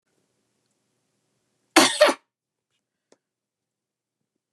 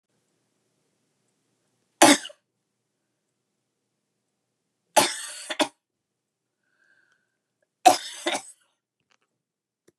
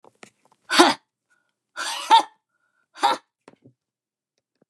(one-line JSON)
{"cough_length": "4.5 s", "cough_amplitude": 32768, "cough_signal_mean_std_ratio": 0.2, "three_cough_length": "10.0 s", "three_cough_amplitude": 31609, "three_cough_signal_mean_std_ratio": 0.19, "exhalation_length": "4.7 s", "exhalation_amplitude": 32553, "exhalation_signal_mean_std_ratio": 0.27, "survey_phase": "beta (2021-08-13 to 2022-03-07)", "age": "45-64", "gender": "Female", "wearing_mask": "No", "symptom_none": true, "smoker_status": "Never smoked", "respiratory_condition_asthma": false, "respiratory_condition_other": false, "recruitment_source": "REACT", "submission_delay": "1 day", "covid_test_result": "Negative", "covid_test_method": "RT-qPCR", "influenza_a_test_result": "Negative", "influenza_b_test_result": "Negative"}